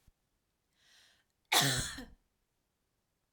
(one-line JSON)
{"cough_length": "3.3 s", "cough_amplitude": 7086, "cough_signal_mean_std_ratio": 0.28, "survey_phase": "alpha (2021-03-01 to 2021-08-12)", "age": "18-44", "gender": "Female", "wearing_mask": "No", "symptom_none": true, "smoker_status": "Never smoked", "respiratory_condition_asthma": false, "respiratory_condition_other": false, "recruitment_source": "REACT", "submission_delay": "2 days", "covid_test_result": "Negative", "covid_test_method": "RT-qPCR"}